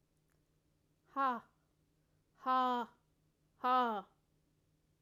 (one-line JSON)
{"exhalation_length": "5.0 s", "exhalation_amplitude": 2567, "exhalation_signal_mean_std_ratio": 0.37, "survey_phase": "alpha (2021-03-01 to 2021-08-12)", "age": "45-64", "gender": "Female", "wearing_mask": "No", "symptom_none": true, "smoker_status": "Never smoked", "respiratory_condition_asthma": false, "respiratory_condition_other": false, "recruitment_source": "REACT", "submission_delay": "2 days", "covid_test_result": "Negative", "covid_test_method": "RT-qPCR"}